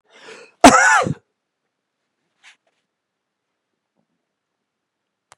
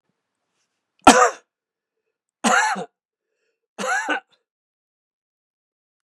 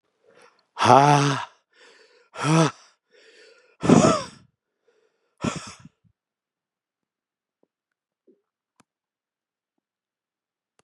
{"cough_length": "5.4 s", "cough_amplitude": 32768, "cough_signal_mean_std_ratio": 0.22, "three_cough_length": "6.1 s", "three_cough_amplitude": 32768, "three_cough_signal_mean_std_ratio": 0.27, "exhalation_length": "10.8 s", "exhalation_amplitude": 31448, "exhalation_signal_mean_std_ratio": 0.26, "survey_phase": "beta (2021-08-13 to 2022-03-07)", "age": "65+", "gender": "Male", "wearing_mask": "No", "symptom_runny_or_blocked_nose": true, "symptom_shortness_of_breath": true, "smoker_status": "Never smoked", "respiratory_condition_asthma": false, "respiratory_condition_other": false, "recruitment_source": "REACT", "submission_delay": "2 days", "covid_test_result": "Negative", "covid_test_method": "RT-qPCR", "influenza_a_test_result": "Negative", "influenza_b_test_result": "Negative"}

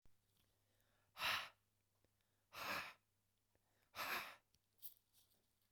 {"exhalation_length": "5.7 s", "exhalation_amplitude": 1136, "exhalation_signal_mean_std_ratio": 0.35, "survey_phase": "beta (2021-08-13 to 2022-03-07)", "age": "18-44", "gender": "Female", "wearing_mask": "No", "symptom_none": true, "smoker_status": "Ex-smoker", "respiratory_condition_asthma": false, "respiratory_condition_other": false, "recruitment_source": "REACT", "submission_delay": "2 days", "covid_test_result": "Negative", "covid_test_method": "RT-qPCR", "influenza_a_test_result": "Unknown/Void", "influenza_b_test_result": "Unknown/Void"}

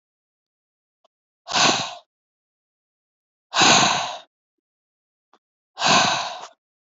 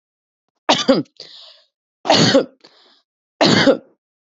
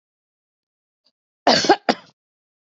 {"exhalation_length": "6.8 s", "exhalation_amplitude": 26453, "exhalation_signal_mean_std_ratio": 0.36, "three_cough_length": "4.3 s", "three_cough_amplitude": 30350, "three_cough_signal_mean_std_ratio": 0.4, "cough_length": "2.7 s", "cough_amplitude": 32639, "cough_signal_mean_std_ratio": 0.25, "survey_phase": "beta (2021-08-13 to 2022-03-07)", "age": "18-44", "gender": "Female", "wearing_mask": "No", "symptom_none": true, "smoker_status": "Current smoker (11 or more cigarettes per day)", "respiratory_condition_asthma": false, "respiratory_condition_other": false, "recruitment_source": "REACT", "submission_delay": "1 day", "covid_test_result": "Negative", "covid_test_method": "RT-qPCR"}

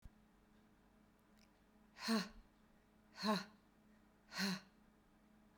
{"exhalation_length": "5.6 s", "exhalation_amplitude": 1491, "exhalation_signal_mean_std_ratio": 0.35, "survey_phase": "beta (2021-08-13 to 2022-03-07)", "age": "45-64", "gender": "Female", "wearing_mask": "No", "symptom_headache": true, "smoker_status": "Never smoked", "respiratory_condition_asthma": false, "respiratory_condition_other": false, "recruitment_source": "REACT", "submission_delay": "2 days", "covid_test_result": "Negative", "covid_test_method": "RT-qPCR"}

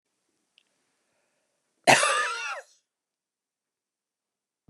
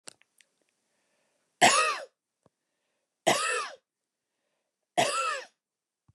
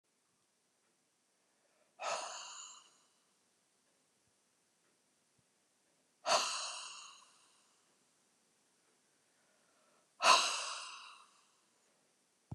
{"cough_length": "4.7 s", "cough_amplitude": 23594, "cough_signal_mean_std_ratio": 0.25, "three_cough_length": "6.1 s", "three_cough_amplitude": 15730, "three_cough_signal_mean_std_ratio": 0.33, "exhalation_length": "12.5 s", "exhalation_amplitude": 7344, "exhalation_signal_mean_std_ratio": 0.25, "survey_phase": "beta (2021-08-13 to 2022-03-07)", "age": "45-64", "gender": "Female", "wearing_mask": "No", "symptom_none": true, "smoker_status": "Never smoked", "respiratory_condition_asthma": false, "respiratory_condition_other": false, "recruitment_source": "REACT", "submission_delay": "2 days", "covid_test_result": "Negative", "covid_test_method": "RT-qPCR"}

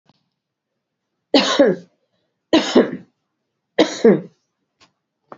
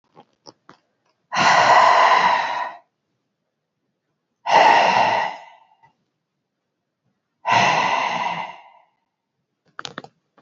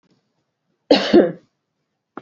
{"three_cough_length": "5.4 s", "three_cough_amplitude": 31946, "three_cough_signal_mean_std_ratio": 0.33, "exhalation_length": "10.4 s", "exhalation_amplitude": 26388, "exhalation_signal_mean_std_ratio": 0.45, "cough_length": "2.2 s", "cough_amplitude": 32768, "cough_signal_mean_std_ratio": 0.3, "survey_phase": "beta (2021-08-13 to 2022-03-07)", "age": "45-64", "gender": "Female", "wearing_mask": "No", "symptom_cough_any": true, "symptom_runny_or_blocked_nose": true, "symptom_fatigue": true, "symptom_headache": true, "symptom_change_to_sense_of_smell_or_taste": true, "smoker_status": "Never smoked", "respiratory_condition_asthma": false, "respiratory_condition_other": false, "recruitment_source": "Test and Trace", "submission_delay": "2 days", "covid_test_result": "Positive", "covid_test_method": "RT-qPCR", "covid_ct_value": 29.7, "covid_ct_gene": "N gene", "covid_ct_mean": 30.4, "covid_viral_load": "110 copies/ml", "covid_viral_load_category": "Minimal viral load (< 10K copies/ml)"}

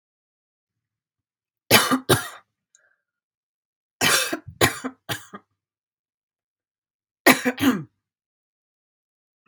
{"three_cough_length": "9.5 s", "three_cough_amplitude": 32768, "three_cough_signal_mean_std_ratio": 0.28, "survey_phase": "beta (2021-08-13 to 2022-03-07)", "age": "45-64", "gender": "Female", "wearing_mask": "No", "symptom_fatigue": true, "symptom_onset": "5 days", "smoker_status": "Ex-smoker", "respiratory_condition_asthma": false, "respiratory_condition_other": false, "recruitment_source": "REACT", "submission_delay": "1 day", "covid_test_result": "Negative", "covid_test_method": "RT-qPCR", "influenza_a_test_result": "Negative", "influenza_b_test_result": "Negative"}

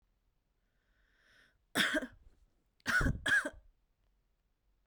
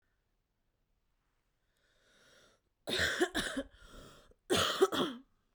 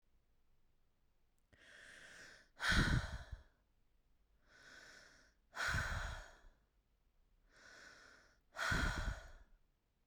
{"three_cough_length": "4.9 s", "three_cough_amplitude": 4891, "three_cough_signal_mean_std_ratio": 0.35, "cough_length": "5.5 s", "cough_amplitude": 5447, "cough_signal_mean_std_ratio": 0.38, "exhalation_length": "10.1 s", "exhalation_amplitude": 3153, "exhalation_signal_mean_std_ratio": 0.38, "survey_phase": "beta (2021-08-13 to 2022-03-07)", "age": "18-44", "gender": "Female", "wearing_mask": "No", "symptom_cough_any": true, "symptom_sore_throat": true, "symptom_onset": "8 days", "smoker_status": "Ex-smoker", "respiratory_condition_asthma": false, "respiratory_condition_other": false, "recruitment_source": "REACT", "submission_delay": "1 day", "covid_test_result": "Negative", "covid_test_method": "RT-qPCR", "influenza_a_test_result": "Negative", "influenza_b_test_result": "Negative"}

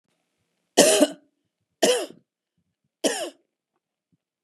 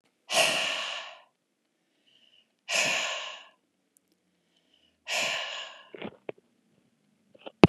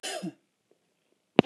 {"three_cough_length": "4.4 s", "three_cough_amplitude": 31070, "three_cough_signal_mean_std_ratio": 0.3, "exhalation_length": "7.7 s", "exhalation_amplitude": 32767, "exhalation_signal_mean_std_ratio": 0.32, "cough_length": "1.5 s", "cough_amplitude": 31443, "cough_signal_mean_std_ratio": 0.16, "survey_phase": "beta (2021-08-13 to 2022-03-07)", "age": "45-64", "gender": "Female", "wearing_mask": "No", "symptom_none": true, "smoker_status": "Never smoked", "respiratory_condition_asthma": false, "respiratory_condition_other": false, "recruitment_source": "REACT", "submission_delay": "3 days", "covid_test_result": "Negative", "covid_test_method": "RT-qPCR"}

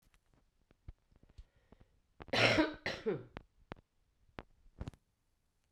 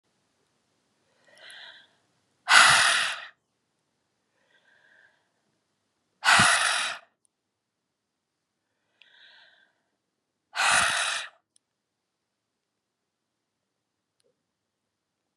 {"cough_length": "5.7 s", "cough_amplitude": 7243, "cough_signal_mean_std_ratio": 0.29, "exhalation_length": "15.4 s", "exhalation_amplitude": 25932, "exhalation_signal_mean_std_ratio": 0.27, "survey_phase": "beta (2021-08-13 to 2022-03-07)", "age": "65+", "gender": "Female", "wearing_mask": "No", "symptom_cough_any": true, "symptom_runny_or_blocked_nose": true, "symptom_fatigue": true, "symptom_headache": true, "symptom_onset": "3 days", "smoker_status": "Current smoker (1 to 10 cigarettes per day)", "respiratory_condition_asthma": false, "respiratory_condition_other": false, "recruitment_source": "Test and Trace", "submission_delay": "2 days", "covid_test_result": "Positive", "covid_test_method": "RT-qPCR", "covid_ct_value": 20.8, "covid_ct_gene": "ORF1ab gene"}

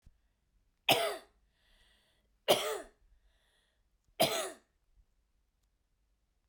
{"three_cough_length": "6.5 s", "three_cough_amplitude": 8201, "three_cough_signal_mean_std_ratio": 0.27, "survey_phase": "beta (2021-08-13 to 2022-03-07)", "age": "45-64", "gender": "Female", "wearing_mask": "No", "symptom_cough_any": true, "symptom_runny_or_blocked_nose": true, "symptom_onset": "5 days", "smoker_status": "Never smoked", "respiratory_condition_asthma": false, "respiratory_condition_other": false, "recruitment_source": "REACT", "submission_delay": "1 day", "covid_test_result": "Negative", "covid_test_method": "RT-qPCR"}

